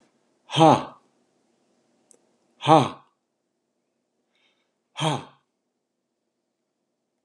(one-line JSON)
{"exhalation_length": "7.2 s", "exhalation_amplitude": 27088, "exhalation_signal_mean_std_ratio": 0.21, "survey_phase": "alpha (2021-03-01 to 2021-08-12)", "age": "45-64", "gender": "Male", "wearing_mask": "No", "symptom_none": true, "smoker_status": "Ex-smoker", "respiratory_condition_asthma": false, "respiratory_condition_other": false, "recruitment_source": "REACT", "submission_delay": "2 days", "covid_test_result": "Negative", "covid_test_method": "RT-qPCR"}